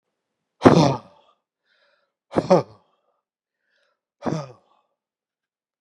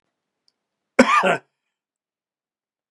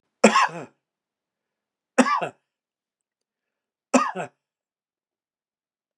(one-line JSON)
{"exhalation_length": "5.8 s", "exhalation_amplitude": 32768, "exhalation_signal_mean_std_ratio": 0.24, "cough_length": "2.9 s", "cough_amplitude": 32767, "cough_signal_mean_std_ratio": 0.26, "three_cough_length": "6.0 s", "three_cough_amplitude": 27728, "three_cough_signal_mean_std_ratio": 0.25, "survey_phase": "beta (2021-08-13 to 2022-03-07)", "age": "45-64", "gender": "Male", "wearing_mask": "No", "symptom_none": true, "smoker_status": "Never smoked", "respiratory_condition_asthma": false, "respiratory_condition_other": false, "recruitment_source": "REACT", "submission_delay": "1 day", "covid_test_result": "Negative", "covid_test_method": "RT-qPCR", "influenza_a_test_result": "Negative", "influenza_b_test_result": "Negative"}